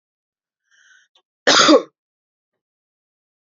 {"cough_length": "3.4 s", "cough_amplitude": 30878, "cough_signal_mean_std_ratio": 0.25, "survey_phase": "beta (2021-08-13 to 2022-03-07)", "age": "18-44", "gender": "Female", "wearing_mask": "No", "symptom_sore_throat": true, "symptom_fatigue": true, "symptom_headache": true, "symptom_onset": "5 days", "smoker_status": "Ex-smoker", "respiratory_condition_asthma": false, "respiratory_condition_other": false, "recruitment_source": "Test and Trace", "submission_delay": "1 day", "covid_test_result": "Positive", "covid_test_method": "RT-qPCR", "covid_ct_value": 32.9, "covid_ct_gene": "N gene"}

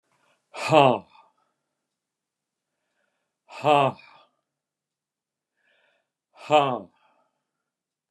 {"exhalation_length": "8.1 s", "exhalation_amplitude": 26062, "exhalation_signal_mean_std_ratio": 0.24, "survey_phase": "beta (2021-08-13 to 2022-03-07)", "age": "65+", "gender": "Male", "wearing_mask": "No", "symptom_none": true, "smoker_status": "Ex-smoker", "respiratory_condition_asthma": false, "respiratory_condition_other": false, "recruitment_source": "REACT", "submission_delay": "1 day", "covid_test_result": "Negative", "covid_test_method": "RT-qPCR"}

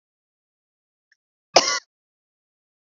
{"cough_length": "2.9 s", "cough_amplitude": 29728, "cough_signal_mean_std_ratio": 0.17, "survey_phase": "beta (2021-08-13 to 2022-03-07)", "age": "18-44", "gender": "Female", "wearing_mask": "No", "symptom_cough_any": true, "symptom_runny_or_blocked_nose": true, "symptom_shortness_of_breath": true, "symptom_sore_throat": true, "symptom_fatigue": true, "symptom_fever_high_temperature": true, "symptom_headache": true, "symptom_onset": "2 days", "smoker_status": "Never smoked", "respiratory_condition_asthma": false, "respiratory_condition_other": false, "recruitment_source": "Test and Trace", "submission_delay": "2 days", "covid_test_result": "Positive", "covid_test_method": "RT-qPCR", "covid_ct_value": 25.8, "covid_ct_gene": "ORF1ab gene", "covid_ct_mean": 26.2, "covid_viral_load": "2500 copies/ml", "covid_viral_load_category": "Minimal viral load (< 10K copies/ml)"}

